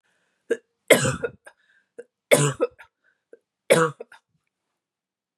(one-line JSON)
{"three_cough_length": "5.4 s", "three_cough_amplitude": 31274, "three_cough_signal_mean_std_ratio": 0.29, "survey_phase": "beta (2021-08-13 to 2022-03-07)", "age": "45-64", "gender": "Female", "wearing_mask": "No", "symptom_none": true, "smoker_status": "Never smoked", "respiratory_condition_asthma": false, "respiratory_condition_other": false, "recruitment_source": "REACT", "submission_delay": "2 days", "covid_test_result": "Negative", "covid_test_method": "RT-qPCR", "influenza_a_test_result": "Negative", "influenza_b_test_result": "Negative"}